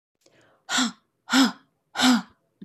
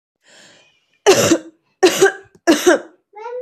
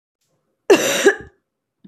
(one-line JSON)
{"exhalation_length": "2.6 s", "exhalation_amplitude": 17325, "exhalation_signal_mean_std_ratio": 0.42, "three_cough_length": "3.4 s", "three_cough_amplitude": 32767, "three_cough_signal_mean_std_ratio": 0.43, "cough_length": "1.9 s", "cough_amplitude": 29886, "cough_signal_mean_std_ratio": 0.35, "survey_phase": "beta (2021-08-13 to 2022-03-07)", "age": "18-44", "gender": "Female", "wearing_mask": "No", "symptom_runny_or_blocked_nose": true, "symptom_shortness_of_breath": true, "symptom_abdominal_pain": true, "symptom_fatigue": true, "symptom_fever_high_temperature": true, "symptom_change_to_sense_of_smell_or_taste": true, "symptom_other": true, "smoker_status": "Never smoked", "respiratory_condition_asthma": false, "respiratory_condition_other": false, "recruitment_source": "Test and Trace", "submission_delay": "3 days", "covid_test_result": "Positive", "covid_test_method": "LFT"}